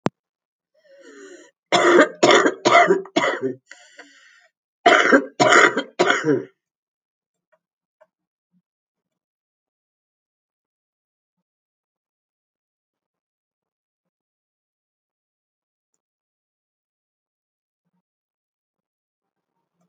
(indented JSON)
{
  "cough_length": "19.9 s",
  "cough_amplitude": 32767,
  "cough_signal_mean_std_ratio": 0.27,
  "survey_phase": "alpha (2021-03-01 to 2021-08-12)",
  "age": "45-64",
  "gender": "Female",
  "wearing_mask": "No",
  "symptom_cough_any": true,
  "symptom_fatigue": true,
  "symptom_headache": true,
  "symptom_onset": "12 days",
  "smoker_status": "Current smoker (11 or more cigarettes per day)",
  "respiratory_condition_asthma": true,
  "respiratory_condition_other": false,
  "recruitment_source": "REACT",
  "submission_delay": "2 days",
  "covid_test_result": "Negative",
  "covid_test_method": "RT-qPCR"
}